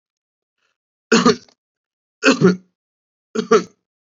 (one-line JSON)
{"three_cough_length": "4.2 s", "three_cough_amplitude": 28060, "three_cough_signal_mean_std_ratio": 0.31, "survey_phase": "beta (2021-08-13 to 2022-03-07)", "age": "18-44", "gender": "Male", "wearing_mask": "No", "symptom_none": true, "smoker_status": "Never smoked", "respiratory_condition_asthma": false, "respiratory_condition_other": false, "recruitment_source": "REACT", "submission_delay": "1 day", "covid_test_result": "Negative", "covid_test_method": "RT-qPCR", "influenza_a_test_result": "Negative", "influenza_b_test_result": "Negative"}